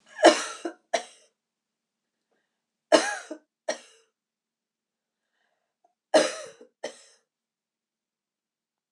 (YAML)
three_cough_length: 8.9 s
three_cough_amplitude: 26028
three_cough_signal_mean_std_ratio: 0.21
survey_phase: beta (2021-08-13 to 2022-03-07)
age: 65+
gender: Female
wearing_mask: 'No'
symptom_none: true
smoker_status: Never smoked
respiratory_condition_asthma: false
respiratory_condition_other: false
recruitment_source: REACT
submission_delay: 0 days
covid_test_result: Negative
covid_test_method: RT-qPCR
influenza_a_test_result: Negative
influenza_b_test_result: Negative